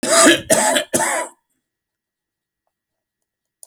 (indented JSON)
{
  "cough_length": "3.7 s",
  "cough_amplitude": 32768,
  "cough_signal_mean_std_ratio": 0.41,
  "survey_phase": "beta (2021-08-13 to 2022-03-07)",
  "age": "45-64",
  "gender": "Male",
  "wearing_mask": "No",
  "symptom_none": true,
  "smoker_status": "Never smoked",
  "respiratory_condition_asthma": false,
  "respiratory_condition_other": false,
  "recruitment_source": "REACT",
  "submission_delay": "1 day",
  "covid_test_result": "Negative",
  "covid_test_method": "RT-qPCR"
}